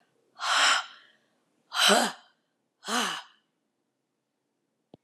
{
  "exhalation_length": "5.0 s",
  "exhalation_amplitude": 14868,
  "exhalation_signal_mean_std_ratio": 0.37,
  "survey_phase": "alpha (2021-03-01 to 2021-08-12)",
  "age": "45-64",
  "gender": "Female",
  "wearing_mask": "No",
  "symptom_none": true,
  "smoker_status": "Never smoked",
  "respiratory_condition_asthma": true,
  "respiratory_condition_other": false,
  "recruitment_source": "REACT",
  "submission_delay": "1 day",
  "covid_test_result": "Negative",
  "covid_test_method": "RT-qPCR"
}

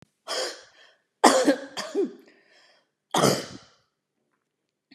{
  "cough_length": "4.9 s",
  "cough_amplitude": 32767,
  "cough_signal_mean_std_ratio": 0.35,
  "survey_phase": "beta (2021-08-13 to 2022-03-07)",
  "age": "65+",
  "gender": "Female",
  "wearing_mask": "No",
  "symptom_none": true,
  "smoker_status": "Never smoked",
  "respiratory_condition_asthma": false,
  "respiratory_condition_other": true,
  "recruitment_source": "REACT",
  "submission_delay": "2 days",
  "covid_test_result": "Negative",
  "covid_test_method": "RT-qPCR",
  "influenza_a_test_result": "Unknown/Void",
  "influenza_b_test_result": "Unknown/Void"
}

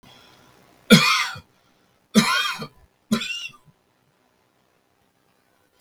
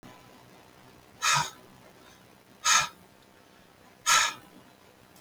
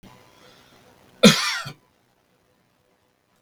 {
  "three_cough_length": "5.8 s",
  "three_cough_amplitude": 32768,
  "three_cough_signal_mean_std_ratio": 0.31,
  "exhalation_length": "5.2 s",
  "exhalation_amplitude": 14031,
  "exhalation_signal_mean_std_ratio": 0.34,
  "cough_length": "3.4 s",
  "cough_amplitude": 32768,
  "cough_signal_mean_std_ratio": 0.22,
  "survey_phase": "beta (2021-08-13 to 2022-03-07)",
  "age": "65+",
  "gender": "Male",
  "wearing_mask": "No",
  "symptom_none": true,
  "smoker_status": "Ex-smoker",
  "respiratory_condition_asthma": false,
  "respiratory_condition_other": false,
  "recruitment_source": "REACT",
  "submission_delay": "2 days",
  "covid_test_result": "Negative",
  "covid_test_method": "RT-qPCR"
}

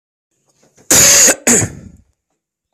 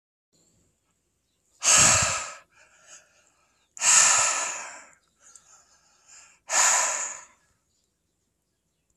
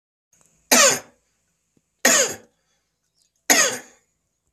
{
  "cough_length": "2.7 s",
  "cough_amplitude": 32768,
  "cough_signal_mean_std_ratio": 0.43,
  "exhalation_length": "9.0 s",
  "exhalation_amplitude": 21854,
  "exhalation_signal_mean_std_ratio": 0.37,
  "three_cough_length": "4.5 s",
  "three_cough_amplitude": 30459,
  "three_cough_signal_mean_std_ratio": 0.33,
  "survey_phase": "beta (2021-08-13 to 2022-03-07)",
  "age": "45-64",
  "gender": "Male",
  "wearing_mask": "No",
  "symptom_cough_any": true,
  "symptom_runny_or_blocked_nose": true,
  "symptom_sore_throat": true,
  "symptom_onset": "3 days",
  "smoker_status": "Never smoked",
  "respiratory_condition_asthma": false,
  "respiratory_condition_other": false,
  "recruitment_source": "Test and Trace",
  "submission_delay": "1 day",
  "covid_test_result": "Positive",
  "covid_test_method": "RT-qPCR",
  "covid_ct_value": 20.8,
  "covid_ct_gene": "N gene"
}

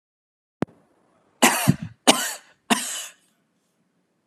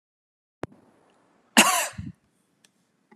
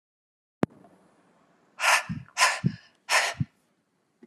{
  "three_cough_length": "4.3 s",
  "three_cough_amplitude": 32614,
  "three_cough_signal_mean_std_ratio": 0.3,
  "cough_length": "3.2 s",
  "cough_amplitude": 28021,
  "cough_signal_mean_std_ratio": 0.24,
  "exhalation_length": "4.3 s",
  "exhalation_amplitude": 16746,
  "exhalation_signal_mean_std_ratio": 0.35,
  "survey_phase": "beta (2021-08-13 to 2022-03-07)",
  "age": "45-64",
  "gender": "Female",
  "wearing_mask": "No",
  "symptom_none": true,
  "smoker_status": "Never smoked",
  "respiratory_condition_asthma": false,
  "respiratory_condition_other": false,
  "recruitment_source": "REACT",
  "submission_delay": "2 days",
  "covid_test_result": "Negative",
  "covid_test_method": "RT-qPCR",
  "influenza_a_test_result": "Negative",
  "influenza_b_test_result": "Negative"
}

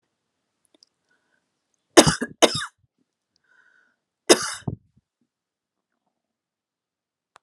{
  "cough_length": "7.4 s",
  "cough_amplitude": 32768,
  "cough_signal_mean_std_ratio": 0.17,
  "survey_phase": "alpha (2021-03-01 to 2021-08-12)",
  "age": "65+",
  "gender": "Female",
  "wearing_mask": "No",
  "symptom_none": true,
  "smoker_status": "Never smoked",
  "respiratory_condition_asthma": false,
  "respiratory_condition_other": false,
  "recruitment_source": "REACT",
  "submission_delay": "2 days",
  "covid_test_result": "Negative",
  "covid_test_method": "RT-qPCR"
}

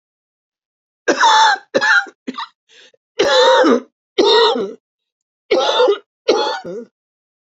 {
  "cough_length": "7.5 s",
  "cough_amplitude": 29730,
  "cough_signal_mean_std_ratio": 0.53,
  "survey_phase": "beta (2021-08-13 to 2022-03-07)",
  "age": "65+",
  "gender": "Female",
  "wearing_mask": "No",
  "symptom_new_continuous_cough": true,
  "symptom_runny_or_blocked_nose": true,
  "symptom_shortness_of_breath": true,
  "symptom_sore_throat": true,
  "symptom_abdominal_pain": true,
  "symptom_fatigue": true,
  "symptom_fever_high_temperature": true,
  "symptom_headache": true,
  "symptom_change_to_sense_of_smell_or_taste": true,
  "symptom_onset": "4 days",
  "smoker_status": "Ex-smoker",
  "respiratory_condition_asthma": true,
  "respiratory_condition_other": false,
  "recruitment_source": "Test and Trace",
  "submission_delay": "1 day",
  "covid_test_result": "Positive",
  "covid_test_method": "RT-qPCR",
  "covid_ct_value": 15.4,
  "covid_ct_gene": "ORF1ab gene",
  "covid_ct_mean": 15.4,
  "covid_viral_load": "9000000 copies/ml",
  "covid_viral_load_category": "High viral load (>1M copies/ml)"
}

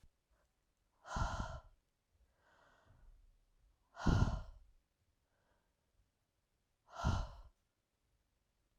{
  "exhalation_length": "8.8 s",
  "exhalation_amplitude": 3301,
  "exhalation_signal_mean_std_ratio": 0.28,
  "survey_phase": "alpha (2021-03-01 to 2021-08-12)",
  "age": "45-64",
  "gender": "Female",
  "wearing_mask": "No",
  "symptom_none": true,
  "smoker_status": "Never smoked",
  "respiratory_condition_asthma": false,
  "respiratory_condition_other": false,
  "recruitment_source": "REACT",
  "submission_delay": "0 days",
  "covid_test_result": "Negative",
  "covid_test_method": "RT-qPCR"
}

